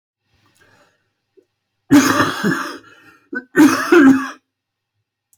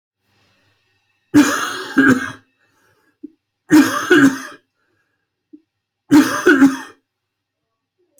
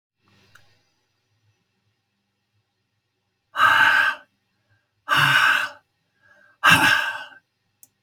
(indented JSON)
{
  "cough_length": "5.4 s",
  "cough_amplitude": 27538,
  "cough_signal_mean_std_ratio": 0.4,
  "three_cough_length": "8.2 s",
  "three_cough_amplitude": 31522,
  "three_cough_signal_mean_std_ratio": 0.38,
  "exhalation_length": "8.0 s",
  "exhalation_amplitude": 28077,
  "exhalation_signal_mean_std_ratio": 0.37,
  "survey_phase": "beta (2021-08-13 to 2022-03-07)",
  "age": "45-64",
  "gender": "Male",
  "wearing_mask": "No",
  "symptom_cough_any": true,
  "symptom_new_continuous_cough": true,
  "symptom_runny_or_blocked_nose": true,
  "symptom_fatigue": true,
  "smoker_status": "Never smoked",
  "respiratory_condition_asthma": false,
  "respiratory_condition_other": false,
  "recruitment_source": "Test and Trace",
  "submission_delay": "2 days",
  "covid_test_result": "Positive",
  "covid_test_method": "RT-qPCR",
  "covid_ct_value": 19.3,
  "covid_ct_gene": "ORF1ab gene"
}